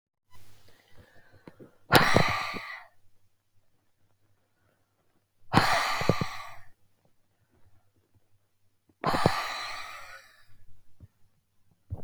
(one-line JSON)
{"exhalation_length": "12.0 s", "exhalation_amplitude": 32767, "exhalation_signal_mean_std_ratio": 0.36, "survey_phase": "alpha (2021-03-01 to 2021-08-12)", "age": "45-64", "gender": "Female", "wearing_mask": "No", "symptom_none": true, "smoker_status": "Ex-smoker", "respiratory_condition_asthma": false, "respiratory_condition_other": false, "recruitment_source": "REACT", "submission_delay": "1 day", "covid_test_result": "Negative", "covid_test_method": "RT-qPCR"}